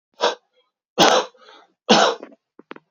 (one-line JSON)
{"three_cough_length": "2.9 s", "three_cough_amplitude": 32767, "three_cough_signal_mean_std_ratio": 0.38, "survey_phase": "beta (2021-08-13 to 2022-03-07)", "age": "18-44", "gender": "Male", "wearing_mask": "No", "symptom_change_to_sense_of_smell_or_taste": true, "symptom_loss_of_taste": true, "symptom_onset": "3 days", "smoker_status": "Never smoked", "respiratory_condition_asthma": false, "respiratory_condition_other": false, "recruitment_source": "Test and Trace", "submission_delay": "2 days", "covid_test_result": "Positive", "covid_test_method": "RT-qPCR", "covid_ct_value": 18.4, "covid_ct_gene": "ORF1ab gene"}